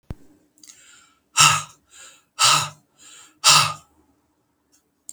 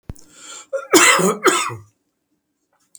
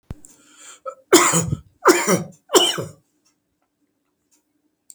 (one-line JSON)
{"exhalation_length": "5.1 s", "exhalation_amplitude": 32767, "exhalation_signal_mean_std_ratio": 0.32, "cough_length": "3.0 s", "cough_amplitude": 32768, "cough_signal_mean_std_ratio": 0.42, "three_cough_length": "4.9 s", "three_cough_amplitude": 32768, "three_cough_signal_mean_std_ratio": 0.36, "survey_phase": "beta (2021-08-13 to 2022-03-07)", "age": "65+", "gender": "Male", "wearing_mask": "No", "symptom_none": true, "symptom_onset": "12 days", "smoker_status": "Ex-smoker", "respiratory_condition_asthma": false, "respiratory_condition_other": false, "recruitment_source": "REACT", "submission_delay": "2 days", "covid_test_result": "Negative", "covid_test_method": "RT-qPCR"}